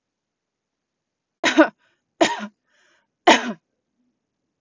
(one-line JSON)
{"three_cough_length": "4.6 s", "three_cough_amplitude": 32768, "three_cough_signal_mean_std_ratio": 0.24, "survey_phase": "beta (2021-08-13 to 2022-03-07)", "age": "18-44", "gender": "Female", "wearing_mask": "No", "symptom_none": true, "smoker_status": "Never smoked", "respiratory_condition_asthma": false, "respiratory_condition_other": false, "recruitment_source": "REACT", "submission_delay": "2 days", "covid_test_result": "Negative", "covid_test_method": "RT-qPCR", "influenza_a_test_result": "Negative", "influenza_b_test_result": "Negative"}